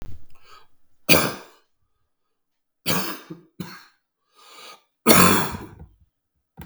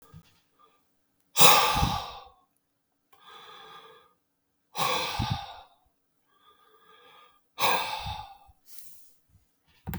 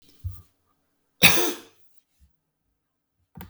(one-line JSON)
{"three_cough_length": "6.7 s", "three_cough_amplitude": 32768, "three_cough_signal_mean_std_ratio": 0.32, "exhalation_length": "10.0 s", "exhalation_amplitude": 32053, "exhalation_signal_mean_std_ratio": 0.3, "cough_length": "3.5 s", "cough_amplitude": 32767, "cough_signal_mean_std_ratio": 0.24, "survey_phase": "beta (2021-08-13 to 2022-03-07)", "age": "65+", "gender": "Male", "wearing_mask": "No", "symptom_cough_any": true, "symptom_runny_or_blocked_nose": true, "smoker_status": "Never smoked", "respiratory_condition_asthma": false, "respiratory_condition_other": false, "recruitment_source": "REACT", "submission_delay": "5 days", "covid_test_result": "Negative", "covid_test_method": "RT-qPCR", "influenza_a_test_result": "Unknown/Void", "influenza_b_test_result": "Unknown/Void"}